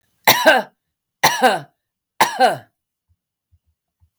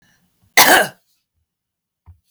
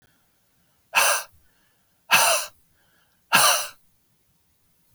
{"three_cough_length": "4.2 s", "three_cough_amplitude": 32768, "three_cough_signal_mean_std_ratio": 0.37, "cough_length": "2.3 s", "cough_amplitude": 32768, "cough_signal_mean_std_ratio": 0.29, "exhalation_length": "4.9 s", "exhalation_amplitude": 28423, "exhalation_signal_mean_std_ratio": 0.35, "survey_phase": "beta (2021-08-13 to 2022-03-07)", "age": "45-64", "gender": "Female", "wearing_mask": "No", "symptom_none": true, "smoker_status": "Current smoker (11 or more cigarettes per day)", "respiratory_condition_asthma": false, "respiratory_condition_other": false, "recruitment_source": "Test and Trace", "submission_delay": "1 day", "covid_test_result": "Negative", "covid_test_method": "RT-qPCR"}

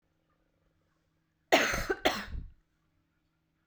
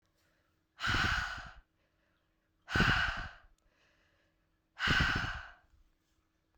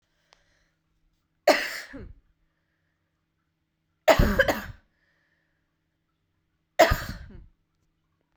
{"cough_length": "3.7 s", "cough_amplitude": 13632, "cough_signal_mean_std_ratio": 0.31, "exhalation_length": "6.6 s", "exhalation_amplitude": 5882, "exhalation_signal_mean_std_ratio": 0.42, "three_cough_length": "8.4 s", "three_cough_amplitude": 26149, "three_cough_signal_mean_std_ratio": 0.25, "survey_phase": "beta (2021-08-13 to 2022-03-07)", "age": "18-44", "gender": "Female", "wearing_mask": "No", "symptom_cough_any": true, "symptom_fatigue": true, "symptom_change_to_sense_of_smell_or_taste": true, "symptom_loss_of_taste": true, "symptom_onset": "7 days", "smoker_status": "Never smoked", "respiratory_condition_asthma": false, "respiratory_condition_other": false, "recruitment_source": "Test and Trace", "submission_delay": "2 days", "covid_test_result": "Positive", "covid_test_method": "RT-qPCR", "covid_ct_value": 15.2, "covid_ct_gene": "ORF1ab gene", "covid_ct_mean": 15.6, "covid_viral_load": "7500000 copies/ml", "covid_viral_load_category": "High viral load (>1M copies/ml)"}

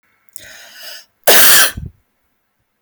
{"cough_length": "2.8 s", "cough_amplitude": 32768, "cough_signal_mean_std_ratio": 0.39, "survey_phase": "alpha (2021-03-01 to 2021-08-12)", "age": "18-44", "gender": "Female", "wearing_mask": "No", "symptom_none": true, "smoker_status": "Never smoked", "respiratory_condition_asthma": false, "respiratory_condition_other": false, "recruitment_source": "REACT", "submission_delay": "1 day", "covid_test_result": "Negative", "covid_test_method": "RT-qPCR"}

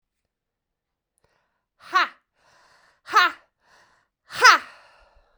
{"exhalation_length": "5.4 s", "exhalation_amplitude": 32767, "exhalation_signal_mean_std_ratio": 0.23, "survey_phase": "beta (2021-08-13 to 2022-03-07)", "age": "18-44", "gender": "Female", "wearing_mask": "No", "symptom_runny_or_blocked_nose": true, "symptom_fatigue": true, "smoker_status": "Never smoked", "respiratory_condition_asthma": true, "respiratory_condition_other": false, "recruitment_source": "Test and Trace", "submission_delay": "2 days", "covid_test_result": "Positive", "covid_test_method": "ePCR"}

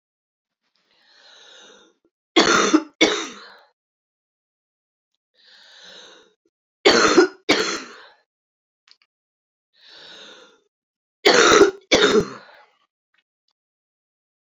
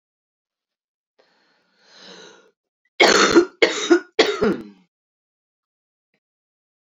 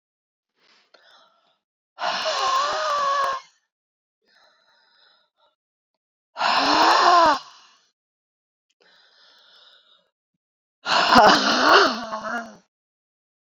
{"three_cough_length": "14.4 s", "three_cough_amplitude": 29450, "three_cough_signal_mean_std_ratio": 0.31, "cough_length": "6.8 s", "cough_amplitude": 29154, "cough_signal_mean_std_ratio": 0.31, "exhalation_length": "13.5 s", "exhalation_amplitude": 28427, "exhalation_signal_mean_std_ratio": 0.41, "survey_phase": "beta (2021-08-13 to 2022-03-07)", "age": "45-64", "gender": "Female", "wearing_mask": "No", "symptom_cough_any": true, "symptom_fatigue": true, "symptom_fever_high_temperature": true, "symptom_headache": true, "symptom_change_to_sense_of_smell_or_taste": true, "symptom_loss_of_taste": true, "symptom_other": true, "symptom_onset": "4 days", "smoker_status": "Never smoked", "respiratory_condition_asthma": false, "respiratory_condition_other": false, "recruitment_source": "Test and Trace", "submission_delay": "1 day", "covid_test_result": "Positive", "covid_test_method": "RT-qPCR", "covid_ct_value": 14.1, "covid_ct_gene": "ORF1ab gene"}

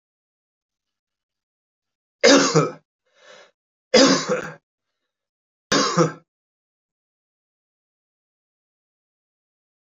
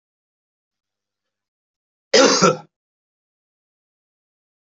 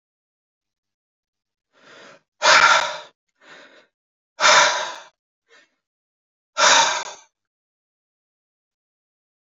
{"three_cough_length": "9.8 s", "three_cough_amplitude": 27077, "three_cough_signal_mean_std_ratio": 0.27, "cough_length": "4.6 s", "cough_amplitude": 29034, "cough_signal_mean_std_ratio": 0.23, "exhalation_length": "9.6 s", "exhalation_amplitude": 28787, "exhalation_signal_mean_std_ratio": 0.3, "survey_phase": "alpha (2021-03-01 to 2021-08-12)", "age": "65+", "gender": "Male", "wearing_mask": "No", "symptom_none": true, "smoker_status": "Never smoked", "respiratory_condition_asthma": false, "respiratory_condition_other": false, "recruitment_source": "REACT", "submission_delay": "2 days", "covid_test_result": "Negative", "covid_test_method": "RT-qPCR"}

